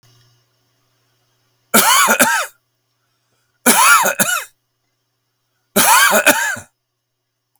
{"three_cough_length": "7.6 s", "three_cough_amplitude": 32768, "three_cough_signal_mean_std_ratio": 0.44, "survey_phase": "beta (2021-08-13 to 2022-03-07)", "age": "65+", "gender": "Male", "wearing_mask": "No", "symptom_none": true, "smoker_status": "Ex-smoker", "respiratory_condition_asthma": false, "respiratory_condition_other": false, "recruitment_source": "REACT", "submission_delay": "3 days", "covid_test_result": "Negative", "covid_test_method": "RT-qPCR", "influenza_a_test_result": "Negative", "influenza_b_test_result": "Negative"}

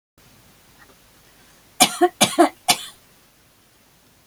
{"three_cough_length": "4.3 s", "three_cough_amplitude": 32768, "three_cough_signal_mean_std_ratio": 0.27, "survey_phase": "beta (2021-08-13 to 2022-03-07)", "age": "65+", "gender": "Female", "wearing_mask": "No", "symptom_none": true, "smoker_status": "Ex-smoker", "respiratory_condition_asthma": false, "respiratory_condition_other": false, "recruitment_source": "REACT", "submission_delay": "2 days", "covid_test_result": "Negative", "covid_test_method": "RT-qPCR", "influenza_a_test_result": "Negative", "influenza_b_test_result": "Negative"}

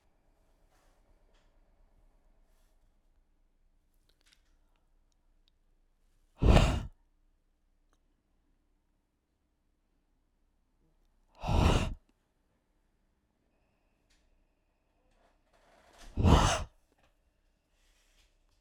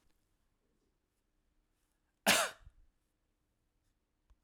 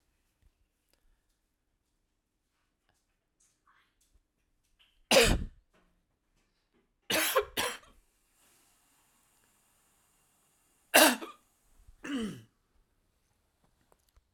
{"exhalation_length": "18.6 s", "exhalation_amplitude": 12070, "exhalation_signal_mean_std_ratio": 0.21, "cough_length": "4.4 s", "cough_amplitude": 6237, "cough_signal_mean_std_ratio": 0.18, "three_cough_length": "14.3 s", "three_cough_amplitude": 16876, "three_cough_signal_mean_std_ratio": 0.22, "survey_phase": "alpha (2021-03-01 to 2021-08-12)", "age": "18-44", "gender": "Male", "wearing_mask": "No", "symptom_none": true, "smoker_status": "Never smoked", "respiratory_condition_asthma": false, "respiratory_condition_other": false, "recruitment_source": "REACT", "submission_delay": "4 days", "covid_test_result": "Negative", "covid_test_method": "RT-qPCR"}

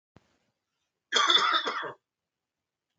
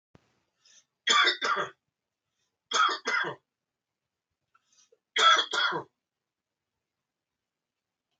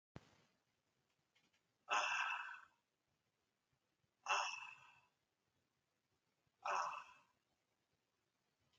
{"cough_length": "3.0 s", "cough_amplitude": 11208, "cough_signal_mean_std_ratio": 0.38, "three_cough_length": "8.2 s", "three_cough_amplitude": 11732, "three_cough_signal_mean_std_ratio": 0.34, "exhalation_length": "8.8 s", "exhalation_amplitude": 1942, "exhalation_signal_mean_std_ratio": 0.32, "survey_phase": "beta (2021-08-13 to 2022-03-07)", "age": "45-64", "gender": "Male", "wearing_mask": "No", "symptom_none": true, "symptom_onset": "12 days", "smoker_status": "Never smoked", "respiratory_condition_asthma": false, "respiratory_condition_other": false, "recruitment_source": "REACT", "submission_delay": "1 day", "covid_test_result": "Negative", "covid_test_method": "RT-qPCR"}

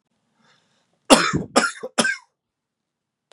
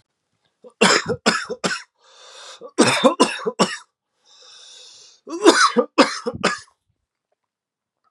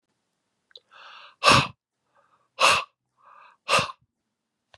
{"cough_length": "3.3 s", "cough_amplitude": 32767, "cough_signal_mean_std_ratio": 0.31, "three_cough_length": "8.1 s", "three_cough_amplitude": 32768, "three_cough_signal_mean_std_ratio": 0.39, "exhalation_length": "4.8 s", "exhalation_amplitude": 23726, "exhalation_signal_mean_std_ratio": 0.29, "survey_phase": "beta (2021-08-13 to 2022-03-07)", "age": "45-64", "gender": "Male", "wearing_mask": "No", "symptom_cough_any": true, "symptom_new_continuous_cough": true, "symptom_runny_or_blocked_nose": true, "symptom_sore_throat": true, "symptom_headache": true, "symptom_other": true, "symptom_onset": "5 days", "smoker_status": "Current smoker (e-cigarettes or vapes only)", "respiratory_condition_asthma": false, "respiratory_condition_other": false, "recruitment_source": "Test and Trace", "submission_delay": "1 day", "covid_test_result": "Positive", "covid_test_method": "RT-qPCR", "covid_ct_value": 17.3, "covid_ct_gene": "ORF1ab gene", "covid_ct_mean": 17.5, "covid_viral_load": "1800000 copies/ml", "covid_viral_load_category": "High viral load (>1M copies/ml)"}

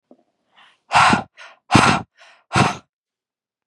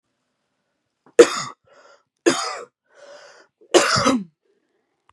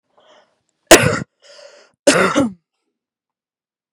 {"exhalation_length": "3.7 s", "exhalation_amplitude": 32768, "exhalation_signal_mean_std_ratio": 0.37, "three_cough_length": "5.1 s", "three_cough_amplitude": 32768, "three_cough_signal_mean_std_ratio": 0.29, "cough_length": "3.9 s", "cough_amplitude": 32768, "cough_signal_mean_std_ratio": 0.3, "survey_phase": "beta (2021-08-13 to 2022-03-07)", "age": "18-44", "gender": "Female", "wearing_mask": "No", "symptom_none": true, "smoker_status": "Never smoked", "respiratory_condition_asthma": true, "respiratory_condition_other": false, "recruitment_source": "REACT", "submission_delay": "4 days", "covid_test_result": "Negative", "covid_test_method": "RT-qPCR", "influenza_a_test_result": "Negative", "influenza_b_test_result": "Negative"}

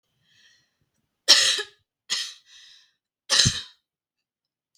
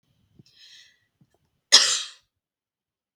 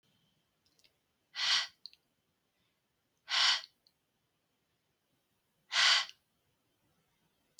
{"three_cough_length": "4.8 s", "three_cough_amplitude": 32766, "three_cough_signal_mean_std_ratio": 0.29, "cough_length": "3.2 s", "cough_amplitude": 32768, "cough_signal_mean_std_ratio": 0.21, "exhalation_length": "7.6 s", "exhalation_amplitude": 6460, "exhalation_signal_mean_std_ratio": 0.27, "survey_phase": "beta (2021-08-13 to 2022-03-07)", "age": "18-44", "gender": "Female", "wearing_mask": "No", "symptom_abdominal_pain": true, "symptom_diarrhoea": true, "smoker_status": "Never smoked", "respiratory_condition_asthma": false, "respiratory_condition_other": false, "recruitment_source": "REACT", "submission_delay": "0 days", "covid_test_result": "Negative", "covid_test_method": "RT-qPCR"}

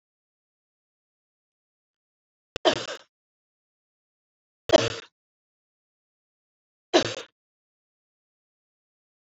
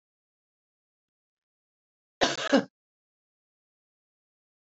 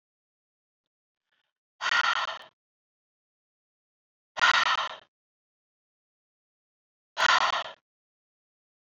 {"three_cough_length": "9.4 s", "three_cough_amplitude": 24117, "three_cough_signal_mean_std_ratio": 0.16, "cough_length": "4.7 s", "cough_amplitude": 11289, "cough_signal_mean_std_ratio": 0.19, "exhalation_length": "9.0 s", "exhalation_amplitude": 12474, "exhalation_signal_mean_std_ratio": 0.3, "survey_phase": "beta (2021-08-13 to 2022-03-07)", "age": "45-64", "gender": "Female", "wearing_mask": "No", "symptom_fatigue": true, "symptom_headache": true, "symptom_change_to_sense_of_smell_or_taste": true, "symptom_onset": "7 days", "smoker_status": "Never smoked", "respiratory_condition_asthma": false, "respiratory_condition_other": false, "recruitment_source": "Test and Trace", "submission_delay": "2 days", "covid_test_result": "Positive", "covid_test_method": "ePCR"}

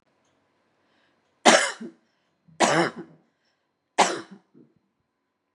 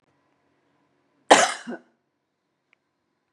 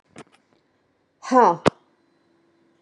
{"three_cough_length": "5.5 s", "three_cough_amplitude": 32712, "three_cough_signal_mean_std_ratio": 0.27, "cough_length": "3.3 s", "cough_amplitude": 32061, "cough_signal_mean_std_ratio": 0.19, "exhalation_length": "2.8 s", "exhalation_amplitude": 28582, "exhalation_signal_mean_std_ratio": 0.25, "survey_phase": "beta (2021-08-13 to 2022-03-07)", "age": "65+", "gender": "Female", "wearing_mask": "No", "symptom_none": true, "smoker_status": "Never smoked", "respiratory_condition_asthma": false, "respiratory_condition_other": false, "recruitment_source": "REACT", "submission_delay": "6 days", "covid_test_result": "Negative", "covid_test_method": "RT-qPCR", "influenza_a_test_result": "Negative", "influenza_b_test_result": "Negative"}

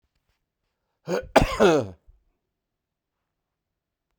{"cough_length": "4.2 s", "cough_amplitude": 23463, "cough_signal_mean_std_ratio": 0.28, "survey_phase": "beta (2021-08-13 to 2022-03-07)", "age": "65+", "gender": "Male", "wearing_mask": "Yes", "symptom_runny_or_blocked_nose": true, "symptom_fatigue": true, "symptom_loss_of_taste": true, "symptom_other": true, "smoker_status": "Ex-smoker", "respiratory_condition_asthma": false, "respiratory_condition_other": false, "recruitment_source": "Test and Trace", "submission_delay": "2 days", "covid_test_result": "Positive", "covid_test_method": "RT-qPCR", "covid_ct_value": 25.5, "covid_ct_gene": "ORF1ab gene"}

